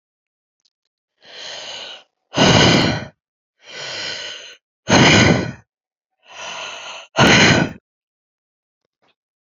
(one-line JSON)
{"exhalation_length": "9.6 s", "exhalation_amplitude": 30814, "exhalation_signal_mean_std_ratio": 0.4, "survey_phase": "beta (2021-08-13 to 2022-03-07)", "age": "18-44", "gender": "Female", "wearing_mask": "Yes", "symptom_cough_any": true, "symptom_runny_or_blocked_nose": true, "symptom_shortness_of_breath": true, "symptom_fatigue": true, "symptom_headache": true, "symptom_other": true, "symptom_onset": "5 days", "smoker_status": "Ex-smoker", "respiratory_condition_asthma": true, "respiratory_condition_other": false, "recruitment_source": "Test and Trace", "submission_delay": "3 days", "covid_test_result": "Positive", "covid_test_method": "RT-qPCR", "covid_ct_value": 24.2, "covid_ct_gene": "N gene"}